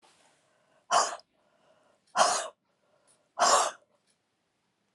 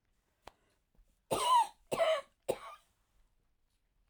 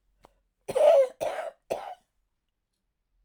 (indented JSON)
{
  "exhalation_length": "4.9 s",
  "exhalation_amplitude": 11178,
  "exhalation_signal_mean_std_ratio": 0.32,
  "three_cough_length": "4.1 s",
  "three_cough_amplitude": 3562,
  "three_cough_signal_mean_std_ratio": 0.35,
  "cough_length": "3.2 s",
  "cough_amplitude": 12594,
  "cough_signal_mean_std_ratio": 0.35,
  "survey_phase": "alpha (2021-03-01 to 2021-08-12)",
  "age": "65+",
  "gender": "Female",
  "wearing_mask": "No",
  "symptom_none": true,
  "smoker_status": "Never smoked",
  "respiratory_condition_asthma": false,
  "respiratory_condition_other": false,
  "recruitment_source": "REACT",
  "submission_delay": "1 day",
  "covid_test_result": "Negative",
  "covid_test_method": "RT-qPCR"
}